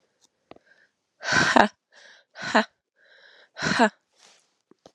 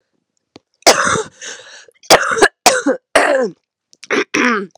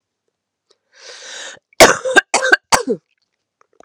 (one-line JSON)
{"exhalation_length": "4.9 s", "exhalation_amplitude": 32767, "exhalation_signal_mean_std_ratio": 0.3, "three_cough_length": "4.8 s", "three_cough_amplitude": 32768, "three_cough_signal_mean_std_ratio": 0.48, "cough_length": "3.8 s", "cough_amplitude": 32768, "cough_signal_mean_std_ratio": 0.31, "survey_phase": "beta (2021-08-13 to 2022-03-07)", "age": "18-44", "gender": "Female", "wearing_mask": "No", "symptom_cough_any": true, "symptom_runny_or_blocked_nose": true, "symptom_shortness_of_breath": true, "symptom_sore_throat": true, "symptom_fatigue": true, "symptom_fever_high_temperature": true, "symptom_headache": true, "symptom_change_to_sense_of_smell_or_taste": true, "symptom_onset": "3 days", "smoker_status": "Ex-smoker", "respiratory_condition_asthma": false, "respiratory_condition_other": false, "recruitment_source": "Test and Trace", "submission_delay": "1 day", "covid_test_result": "Positive", "covid_test_method": "RT-qPCR"}